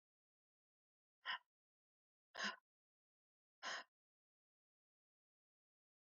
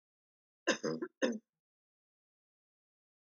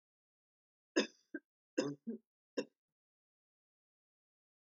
exhalation_length: 6.1 s
exhalation_amplitude: 903
exhalation_signal_mean_std_ratio: 0.22
cough_length: 3.3 s
cough_amplitude: 4242
cough_signal_mean_std_ratio: 0.27
three_cough_length: 4.6 s
three_cough_amplitude: 3162
three_cough_signal_mean_std_ratio: 0.22
survey_phase: alpha (2021-03-01 to 2021-08-12)
age: 65+
gender: Female
wearing_mask: 'No'
symptom_none: true
symptom_onset: 12 days
smoker_status: Never smoked
respiratory_condition_asthma: false
respiratory_condition_other: false
recruitment_source: REACT
submission_delay: 1 day
covid_test_result: Negative
covid_test_method: RT-qPCR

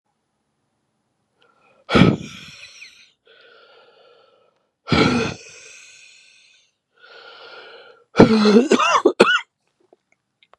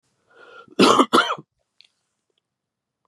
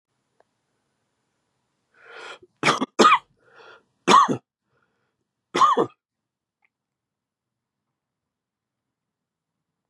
exhalation_length: 10.6 s
exhalation_amplitude: 32768
exhalation_signal_mean_std_ratio: 0.33
cough_length: 3.1 s
cough_amplitude: 30695
cough_signal_mean_std_ratio: 0.3
three_cough_length: 9.9 s
three_cough_amplitude: 27435
three_cough_signal_mean_std_ratio: 0.24
survey_phase: beta (2021-08-13 to 2022-03-07)
age: 45-64
gender: Male
wearing_mask: 'No'
symptom_cough_any: true
symptom_runny_or_blocked_nose: true
symptom_sore_throat: true
symptom_fever_high_temperature: true
symptom_loss_of_taste: true
symptom_other: true
symptom_onset: 3 days
smoker_status: Ex-smoker
respiratory_condition_asthma: false
respiratory_condition_other: false
recruitment_source: Test and Trace
submission_delay: 2 days
covid_test_result: Positive
covid_test_method: RT-qPCR
covid_ct_value: 14.3
covid_ct_gene: ORF1ab gene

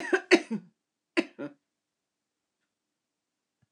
cough_length: 3.7 s
cough_amplitude: 18266
cough_signal_mean_std_ratio: 0.23
survey_phase: beta (2021-08-13 to 2022-03-07)
age: 65+
gender: Female
wearing_mask: 'No'
symptom_none: true
smoker_status: Never smoked
respiratory_condition_asthma: false
respiratory_condition_other: false
recruitment_source: REACT
submission_delay: 2 days
covid_test_result: Positive
covid_test_method: RT-qPCR
covid_ct_value: 25.4
covid_ct_gene: N gene
influenza_a_test_result: Negative
influenza_b_test_result: Negative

